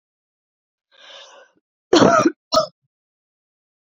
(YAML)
cough_length: 3.8 s
cough_amplitude: 27784
cough_signal_mean_std_ratio: 0.29
survey_phase: beta (2021-08-13 to 2022-03-07)
age: 18-44
gender: Female
wearing_mask: 'No'
symptom_cough_any: true
smoker_status: Never smoked
respiratory_condition_asthma: false
respiratory_condition_other: false
recruitment_source: REACT
submission_delay: 2 days
covid_test_result: Negative
covid_test_method: RT-qPCR
influenza_a_test_result: Unknown/Void
influenza_b_test_result: Unknown/Void